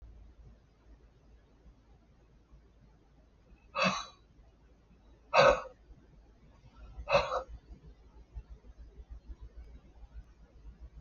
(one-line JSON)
{"exhalation_length": "11.0 s", "exhalation_amplitude": 9699, "exhalation_signal_mean_std_ratio": 0.28, "survey_phase": "beta (2021-08-13 to 2022-03-07)", "age": "65+", "gender": "Male", "wearing_mask": "No", "symptom_diarrhoea": true, "smoker_status": "Ex-smoker", "respiratory_condition_asthma": false, "respiratory_condition_other": false, "recruitment_source": "REACT", "submission_delay": "2 days", "covid_test_result": "Negative", "covid_test_method": "RT-qPCR", "influenza_a_test_result": "Negative", "influenza_b_test_result": "Negative"}